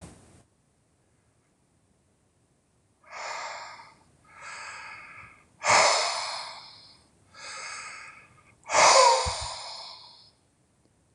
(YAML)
exhalation_length: 11.1 s
exhalation_amplitude: 18907
exhalation_signal_mean_std_ratio: 0.34
survey_phase: beta (2021-08-13 to 2022-03-07)
age: 65+
gender: Male
wearing_mask: 'No'
symptom_cough_any: true
symptom_runny_or_blocked_nose: true
symptom_headache: true
smoker_status: Ex-smoker
respiratory_condition_asthma: false
respiratory_condition_other: false
recruitment_source: Test and Trace
submission_delay: 1 day
covid_test_result: Positive
covid_test_method: LFT